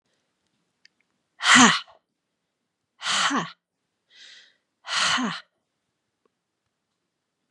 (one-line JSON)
{"exhalation_length": "7.5 s", "exhalation_amplitude": 26306, "exhalation_signal_mean_std_ratio": 0.29, "survey_phase": "beta (2021-08-13 to 2022-03-07)", "age": "45-64", "gender": "Female", "wearing_mask": "No", "symptom_cough_any": true, "symptom_runny_or_blocked_nose": true, "symptom_shortness_of_breath": true, "symptom_fatigue": true, "symptom_change_to_sense_of_smell_or_taste": true, "symptom_loss_of_taste": true, "symptom_onset": "9 days", "smoker_status": "Never smoked", "respiratory_condition_asthma": false, "respiratory_condition_other": false, "recruitment_source": "Test and Trace", "submission_delay": "1 day", "covid_test_result": "Positive", "covid_test_method": "RT-qPCR", "covid_ct_value": 19.6, "covid_ct_gene": "ORF1ab gene", "covid_ct_mean": 20.1, "covid_viral_load": "250000 copies/ml", "covid_viral_load_category": "Low viral load (10K-1M copies/ml)"}